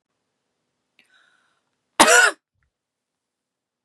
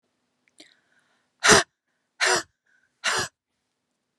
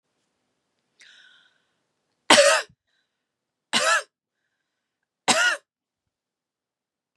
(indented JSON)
{
  "cough_length": "3.8 s",
  "cough_amplitude": 32767,
  "cough_signal_mean_std_ratio": 0.23,
  "exhalation_length": "4.2 s",
  "exhalation_amplitude": 28383,
  "exhalation_signal_mean_std_ratio": 0.28,
  "three_cough_length": "7.2 s",
  "three_cough_amplitude": 32699,
  "three_cough_signal_mean_std_ratio": 0.26,
  "survey_phase": "beta (2021-08-13 to 2022-03-07)",
  "age": "18-44",
  "gender": "Female",
  "wearing_mask": "No",
  "symptom_runny_or_blocked_nose": true,
  "symptom_onset": "4 days",
  "smoker_status": "Ex-smoker",
  "respiratory_condition_asthma": false,
  "respiratory_condition_other": false,
  "recruitment_source": "REACT",
  "submission_delay": "1 day",
  "covid_test_result": "Negative",
  "covid_test_method": "RT-qPCR",
  "influenza_a_test_result": "Negative",
  "influenza_b_test_result": "Negative"
}